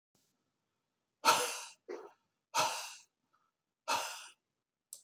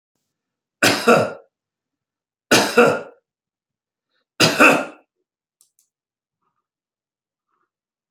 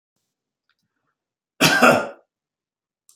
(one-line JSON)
{"exhalation_length": "5.0 s", "exhalation_amplitude": 7797, "exhalation_signal_mean_std_ratio": 0.33, "three_cough_length": "8.1 s", "three_cough_amplitude": 31541, "three_cough_signal_mean_std_ratio": 0.3, "cough_length": "3.2 s", "cough_amplitude": 30167, "cough_signal_mean_std_ratio": 0.29, "survey_phase": "beta (2021-08-13 to 2022-03-07)", "age": "65+", "gender": "Male", "wearing_mask": "No", "symptom_none": true, "smoker_status": "Never smoked", "respiratory_condition_asthma": false, "respiratory_condition_other": true, "recruitment_source": "REACT", "submission_delay": "6 days", "covid_test_result": "Negative", "covid_test_method": "RT-qPCR", "influenza_a_test_result": "Negative", "influenza_b_test_result": "Negative"}